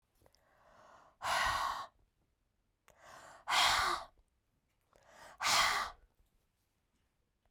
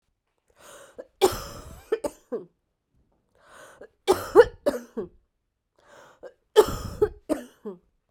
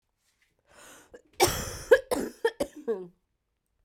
{
  "exhalation_length": "7.5 s",
  "exhalation_amplitude": 4541,
  "exhalation_signal_mean_std_ratio": 0.39,
  "three_cough_length": "8.1 s",
  "three_cough_amplitude": 26683,
  "three_cough_signal_mean_std_ratio": 0.27,
  "cough_length": "3.8 s",
  "cough_amplitude": 15858,
  "cough_signal_mean_std_ratio": 0.32,
  "survey_phase": "beta (2021-08-13 to 2022-03-07)",
  "age": "45-64",
  "gender": "Female",
  "wearing_mask": "No",
  "symptom_cough_any": true,
  "symptom_runny_or_blocked_nose": true,
  "symptom_shortness_of_breath": true,
  "symptom_sore_throat": true,
  "symptom_fatigue": true,
  "symptom_fever_high_temperature": true,
  "symptom_headache": true,
  "symptom_change_to_sense_of_smell_or_taste": true,
  "symptom_loss_of_taste": true,
  "symptom_onset": "4 days",
  "smoker_status": "Current smoker (1 to 10 cigarettes per day)",
  "respiratory_condition_asthma": false,
  "respiratory_condition_other": false,
  "recruitment_source": "Test and Trace",
  "submission_delay": "2 days",
  "covid_test_result": "Positive",
  "covid_test_method": "RT-qPCR",
  "covid_ct_value": 16.6,
  "covid_ct_gene": "ORF1ab gene",
  "covid_ct_mean": 16.9,
  "covid_viral_load": "2800000 copies/ml",
  "covid_viral_load_category": "High viral load (>1M copies/ml)"
}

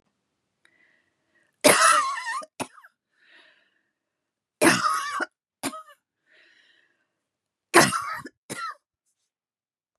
{
  "three_cough_length": "10.0 s",
  "three_cough_amplitude": 31992,
  "three_cough_signal_mean_std_ratio": 0.31,
  "survey_phase": "beta (2021-08-13 to 2022-03-07)",
  "age": "45-64",
  "gender": "Female",
  "wearing_mask": "No",
  "symptom_none": true,
  "smoker_status": "Never smoked",
  "respiratory_condition_asthma": false,
  "respiratory_condition_other": false,
  "recruitment_source": "REACT",
  "submission_delay": "1 day",
  "covid_test_result": "Negative",
  "covid_test_method": "RT-qPCR",
  "influenza_a_test_result": "Negative",
  "influenza_b_test_result": "Negative"
}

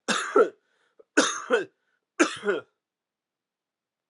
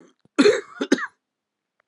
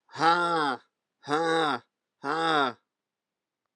{
  "three_cough_length": "4.1 s",
  "three_cough_amplitude": 17408,
  "three_cough_signal_mean_std_ratio": 0.36,
  "cough_length": "1.9 s",
  "cough_amplitude": 21629,
  "cough_signal_mean_std_ratio": 0.34,
  "exhalation_length": "3.8 s",
  "exhalation_amplitude": 11816,
  "exhalation_signal_mean_std_ratio": 0.52,
  "survey_phase": "alpha (2021-03-01 to 2021-08-12)",
  "age": "45-64",
  "gender": "Male",
  "wearing_mask": "No",
  "symptom_cough_any": true,
  "symptom_shortness_of_breath": true,
  "symptom_fever_high_temperature": true,
  "symptom_headache": true,
  "symptom_change_to_sense_of_smell_or_taste": true,
  "symptom_loss_of_taste": true,
  "symptom_onset": "3 days",
  "smoker_status": "Never smoked",
  "respiratory_condition_asthma": false,
  "respiratory_condition_other": false,
  "recruitment_source": "Test and Trace",
  "submission_delay": "2 days",
  "covid_test_result": "Positive",
  "covid_test_method": "RT-qPCR",
  "covid_ct_value": 16.5,
  "covid_ct_gene": "ORF1ab gene",
  "covid_ct_mean": 16.8,
  "covid_viral_load": "3100000 copies/ml",
  "covid_viral_load_category": "High viral load (>1M copies/ml)"
}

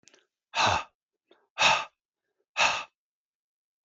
{
  "exhalation_length": "3.8 s",
  "exhalation_amplitude": 13025,
  "exhalation_signal_mean_std_ratio": 0.35,
  "survey_phase": "alpha (2021-03-01 to 2021-08-12)",
  "age": "45-64",
  "gender": "Male",
  "wearing_mask": "No",
  "symptom_cough_any": true,
  "smoker_status": "Never smoked",
  "respiratory_condition_asthma": false,
  "respiratory_condition_other": false,
  "recruitment_source": "REACT",
  "submission_delay": "1 day",
  "covid_test_result": "Negative",
  "covid_test_method": "RT-qPCR"
}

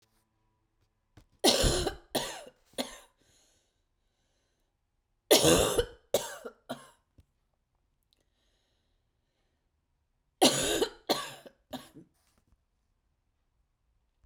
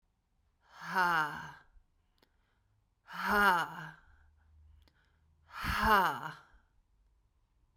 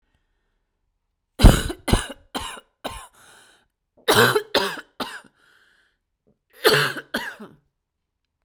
{
  "three_cough_length": "14.3 s",
  "three_cough_amplitude": 14087,
  "three_cough_signal_mean_std_ratio": 0.28,
  "exhalation_length": "7.8 s",
  "exhalation_amplitude": 6616,
  "exhalation_signal_mean_std_ratio": 0.38,
  "cough_length": "8.4 s",
  "cough_amplitude": 32768,
  "cough_signal_mean_std_ratio": 0.3,
  "survey_phase": "beta (2021-08-13 to 2022-03-07)",
  "age": "18-44",
  "gender": "Female",
  "wearing_mask": "No",
  "symptom_cough_any": true,
  "symptom_sore_throat": true,
  "symptom_fatigue": true,
  "symptom_headache": true,
  "symptom_onset": "3 days",
  "smoker_status": "Current smoker (1 to 10 cigarettes per day)",
  "respiratory_condition_asthma": false,
  "respiratory_condition_other": false,
  "recruitment_source": "Test and Trace",
  "submission_delay": "1 day",
  "covid_test_result": "Positive",
  "covid_test_method": "RT-qPCR",
  "covid_ct_value": 34.5,
  "covid_ct_gene": "ORF1ab gene"
}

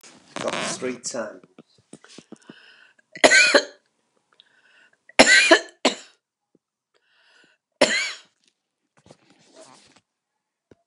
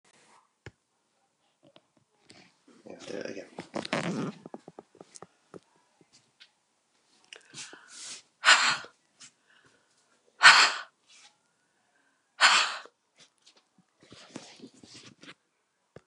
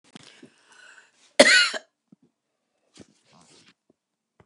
{
  "three_cough_length": "10.9 s",
  "three_cough_amplitude": 31682,
  "three_cough_signal_mean_std_ratio": 0.28,
  "exhalation_length": "16.1 s",
  "exhalation_amplitude": 29125,
  "exhalation_signal_mean_std_ratio": 0.23,
  "cough_length": "4.5 s",
  "cough_amplitude": 31527,
  "cough_signal_mean_std_ratio": 0.21,
  "survey_phase": "beta (2021-08-13 to 2022-03-07)",
  "age": "65+",
  "gender": "Female",
  "wearing_mask": "No",
  "symptom_cough_any": true,
  "symptom_shortness_of_breath": true,
  "symptom_abdominal_pain": true,
  "symptom_diarrhoea": true,
  "symptom_fatigue": true,
  "smoker_status": "Never smoked",
  "respiratory_condition_asthma": false,
  "respiratory_condition_other": false,
  "recruitment_source": "REACT",
  "submission_delay": "3 days",
  "covid_test_result": "Negative",
  "covid_test_method": "RT-qPCR",
  "influenza_a_test_result": "Unknown/Void",
  "influenza_b_test_result": "Unknown/Void"
}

